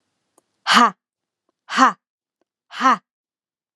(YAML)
exhalation_length: 3.8 s
exhalation_amplitude: 31990
exhalation_signal_mean_std_ratio: 0.31
survey_phase: beta (2021-08-13 to 2022-03-07)
age: 18-44
gender: Female
wearing_mask: 'No'
symptom_none: true
smoker_status: Never smoked
respiratory_condition_asthma: false
respiratory_condition_other: false
recruitment_source: REACT
submission_delay: 1 day
covid_test_result: Negative
covid_test_method: RT-qPCR